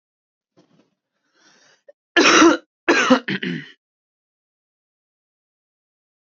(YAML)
cough_length: 6.4 s
cough_amplitude: 29458
cough_signal_mean_std_ratio: 0.29
survey_phase: alpha (2021-03-01 to 2021-08-12)
age: 18-44
gender: Male
wearing_mask: 'No'
symptom_cough_any: true
symptom_change_to_sense_of_smell_or_taste: true
symptom_onset: 3 days
smoker_status: Never smoked
respiratory_condition_asthma: false
respiratory_condition_other: false
recruitment_source: Test and Trace
submission_delay: 2 days
covid_test_result: Positive
covid_test_method: RT-qPCR